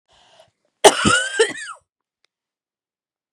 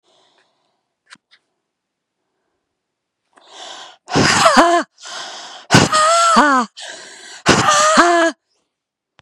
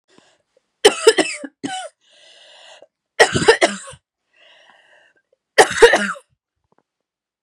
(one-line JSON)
{"cough_length": "3.3 s", "cough_amplitude": 32768, "cough_signal_mean_std_ratio": 0.3, "exhalation_length": "9.2 s", "exhalation_amplitude": 32768, "exhalation_signal_mean_std_ratio": 0.47, "three_cough_length": "7.4 s", "three_cough_amplitude": 32768, "three_cough_signal_mean_std_ratio": 0.3, "survey_phase": "beta (2021-08-13 to 2022-03-07)", "age": "45-64", "gender": "Female", "wearing_mask": "No", "symptom_cough_any": true, "symptom_runny_or_blocked_nose": true, "symptom_shortness_of_breath": true, "symptom_sore_throat": true, "symptom_fatigue": true, "symptom_change_to_sense_of_smell_or_taste": true, "smoker_status": "Never smoked", "respiratory_condition_asthma": false, "respiratory_condition_other": false, "recruitment_source": "Test and Trace", "submission_delay": "2 days", "covid_test_result": "Positive", "covid_test_method": "RT-qPCR", "covid_ct_value": 20.2, "covid_ct_gene": "N gene", "covid_ct_mean": 20.9, "covid_viral_load": "140000 copies/ml", "covid_viral_load_category": "Low viral load (10K-1M copies/ml)"}